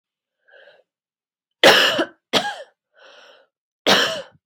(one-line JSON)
{"three_cough_length": "4.5 s", "three_cough_amplitude": 32768, "three_cough_signal_mean_std_ratio": 0.34, "survey_phase": "beta (2021-08-13 to 2022-03-07)", "age": "18-44", "gender": "Female", "wearing_mask": "No", "symptom_none": true, "smoker_status": "Never smoked", "respiratory_condition_asthma": false, "respiratory_condition_other": false, "recruitment_source": "Test and Trace", "submission_delay": "2 days", "covid_test_result": "Negative", "covid_test_method": "RT-qPCR"}